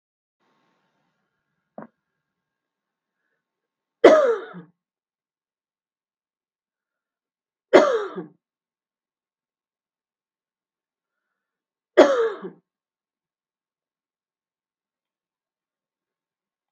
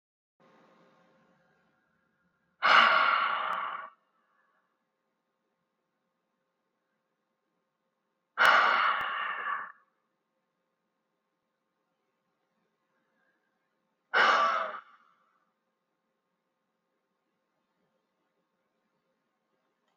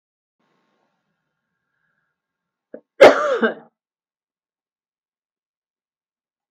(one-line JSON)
{"three_cough_length": "16.7 s", "three_cough_amplitude": 32768, "three_cough_signal_mean_std_ratio": 0.18, "exhalation_length": "20.0 s", "exhalation_amplitude": 11546, "exhalation_signal_mean_std_ratio": 0.28, "cough_length": "6.5 s", "cough_amplitude": 32768, "cough_signal_mean_std_ratio": 0.18, "survey_phase": "beta (2021-08-13 to 2022-03-07)", "age": "45-64", "gender": "Female", "wearing_mask": "No", "symptom_runny_or_blocked_nose": true, "smoker_status": "Ex-smoker", "respiratory_condition_asthma": false, "respiratory_condition_other": false, "recruitment_source": "REACT", "submission_delay": "2 days", "covid_test_result": "Negative", "covid_test_method": "RT-qPCR"}